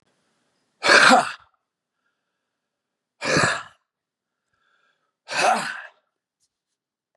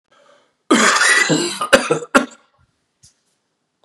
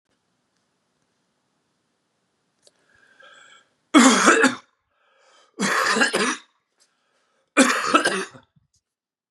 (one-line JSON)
{"exhalation_length": "7.2 s", "exhalation_amplitude": 30140, "exhalation_signal_mean_std_ratio": 0.3, "cough_length": "3.8 s", "cough_amplitude": 32768, "cough_signal_mean_std_ratio": 0.46, "three_cough_length": "9.3 s", "three_cough_amplitude": 29791, "three_cough_signal_mean_std_ratio": 0.34, "survey_phase": "beta (2021-08-13 to 2022-03-07)", "age": "45-64", "gender": "Male", "wearing_mask": "No", "symptom_cough_any": true, "smoker_status": "Never smoked", "respiratory_condition_asthma": false, "respiratory_condition_other": false, "recruitment_source": "Test and Trace", "submission_delay": "2 days", "covid_test_result": "Positive", "covid_test_method": "RT-qPCR", "covid_ct_value": 22.9, "covid_ct_gene": "ORF1ab gene", "covid_ct_mean": 23.5, "covid_viral_load": "20000 copies/ml", "covid_viral_load_category": "Low viral load (10K-1M copies/ml)"}